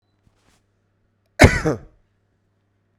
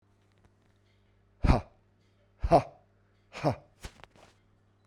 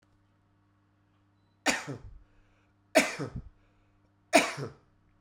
cough_length: 3.0 s
cough_amplitude: 32768
cough_signal_mean_std_ratio: 0.21
exhalation_length: 4.9 s
exhalation_amplitude: 14065
exhalation_signal_mean_std_ratio: 0.25
three_cough_length: 5.2 s
three_cough_amplitude: 15099
three_cough_signal_mean_std_ratio: 0.27
survey_phase: beta (2021-08-13 to 2022-03-07)
age: 45-64
gender: Male
wearing_mask: 'No'
symptom_runny_or_blocked_nose: true
symptom_sore_throat: true
symptom_fatigue: true
symptom_headache: true
smoker_status: Never smoked
respiratory_condition_asthma: false
respiratory_condition_other: false
recruitment_source: Test and Trace
submission_delay: 2 days
covid_test_result: Positive
covid_test_method: RT-qPCR
covid_ct_value: 23.8
covid_ct_gene: ORF1ab gene
covid_ct_mean: 24.4
covid_viral_load: 9800 copies/ml
covid_viral_load_category: Minimal viral load (< 10K copies/ml)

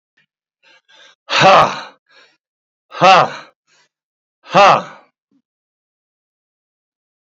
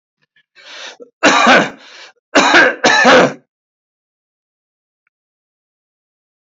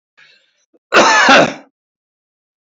exhalation_length: 7.3 s
exhalation_amplitude: 30253
exhalation_signal_mean_std_ratio: 0.3
three_cough_length: 6.6 s
three_cough_amplitude: 31021
three_cough_signal_mean_std_ratio: 0.39
cough_length: 2.6 s
cough_amplitude: 30301
cough_signal_mean_std_ratio: 0.41
survey_phase: beta (2021-08-13 to 2022-03-07)
age: 45-64
gender: Male
wearing_mask: 'Yes'
symptom_none: true
smoker_status: Ex-smoker
respiratory_condition_asthma: false
respiratory_condition_other: false
recruitment_source: REACT
submission_delay: 2 days
covid_test_result: Negative
covid_test_method: RT-qPCR
influenza_a_test_result: Negative
influenza_b_test_result: Negative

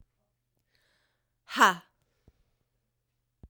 exhalation_length: 3.5 s
exhalation_amplitude: 17983
exhalation_signal_mean_std_ratio: 0.17
survey_phase: beta (2021-08-13 to 2022-03-07)
age: 18-44
gender: Female
wearing_mask: 'No'
symptom_cough_any: true
symptom_runny_or_blocked_nose: true
symptom_shortness_of_breath: true
symptom_fatigue: true
symptom_headache: true
symptom_change_to_sense_of_smell_or_taste: true
symptom_loss_of_taste: true
symptom_onset: 3 days
smoker_status: Never smoked
respiratory_condition_asthma: true
respiratory_condition_other: false
recruitment_source: Test and Trace
submission_delay: 1 day
covid_test_result: Positive
covid_test_method: ePCR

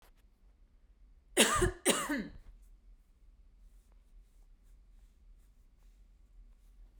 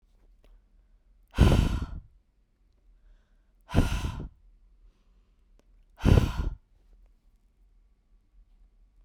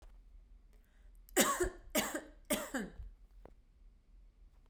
cough_length: 7.0 s
cough_amplitude: 11509
cough_signal_mean_std_ratio: 0.31
exhalation_length: 9.0 s
exhalation_amplitude: 16895
exhalation_signal_mean_std_ratio: 0.29
three_cough_length: 4.7 s
three_cough_amplitude: 7254
three_cough_signal_mean_std_ratio: 0.41
survey_phase: beta (2021-08-13 to 2022-03-07)
age: 18-44
gender: Female
wearing_mask: 'No'
symptom_none: true
smoker_status: Ex-smoker
recruitment_source: REACT
submission_delay: 2 days
covid_test_result: Negative
covid_test_method: RT-qPCR
influenza_a_test_result: Negative
influenza_b_test_result: Negative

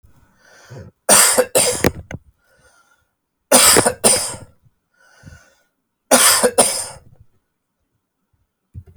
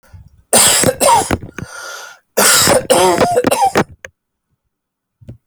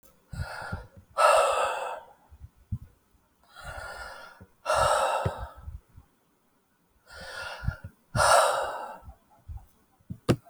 three_cough_length: 9.0 s
three_cough_amplitude: 32768
three_cough_signal_mean_std_ratio: 0.38
cough_length: 5.5 s
cough_amplitude: 32768
cough_signal_mean_std_ratio: 0.57
exhalation_length: 10.5 s
exhalation_amplitude: 14334
exhalation_signal_mean_std_ratio: 0.44
survey_phase: alpha (2021-03-01 to 2021-08-12)
age: 45-64
gender: Male
wearing_mask: 'No'
symptom_none: true
symptom_onset: 12 days
smoker_status: Never smoked
respiratory_condition_asthma: false
respiratory_condition_other: false
recruitment_source: REACT
submission_delay: 1 day
covid_test_result: Negative
covid_test_method: RT-qPCR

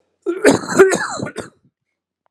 cough_length: 2.3 s
cough_amplitude: 32768
cough_signal_mean_std_ratio: 0.43
survey_phase: alpha (2021-03-01 to 2021-08-12)
age: 18-44
gender: Male
wearing_mask: 'No'
symptom_cough_any: true
symptom_fatigue: true
symptom_fever_high_temperature: true
symptom_headache: true
symptom_change_to_sense_of_smell_or_taste: true
symptom_loss_of_taste: true
symptom_onset: 6 days
smoker_status: Ex-smoker
respiratory_condition_asthma: false
respiratory_condition_other: false
recruitment_source: Test and Trace
submission_delay: 2 days
covid_test_result: Positive
covid_test_method: RT-qPCR
covid_ct_value: 24.6
covid_ct_gene: ORF1ab gene
covid_ct_mean: 24.9
covid_viral_load: 6900 copies/ml
covid_viral_load_category: Minimal viral load (< 10K copies/ml)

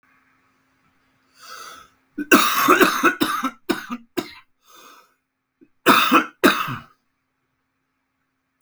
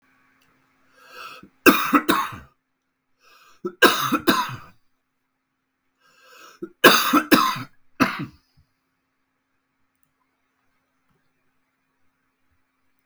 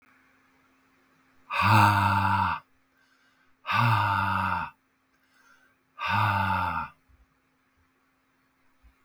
cough_length: 8.6 s
cough_amplitude: 32768
cough_signal_mean_std_ratio: 0.37
three_cough_length: 13.1 s
three_cough_amplitude: 32768
three_cough_signal_mean_std_ratio: 0.28
exhalation_length: 9.0 s
exhalation_amplitude: 14010
exhalation_signal_mean_std_ratio: 0.47
survey_phase: beta (2021-08-13 to 2022-03-07)
age: 45-64
gender: Male
wearing_mask: 'No'
symptom_cough_any: true
symptom_sore_throat: true
symptom_fatigue: true
symptom_fever_high_temperature: true
symptom_headache: true
symptom_change_to_sense_of_smell_or_taste: true
symptom_onset: 5 days
smoker_status: Current smoker (e-cigarettes or vapes only)
respiratory_condition_asthma: false
respiratory_condition_other: false
recruitment_source: Test and Trace
submission_delay: 2 days
covid_test_result: Positive
covid_test_method: RT-qPCR
covid_ct_value: 16.8
covid_ct_gene: ORF1ab gene
covid_ct_mean: 16.9
covid_viral_load: 2800000 copies/ml
covid_viral_load_category: High viral load (>1M copies/ml)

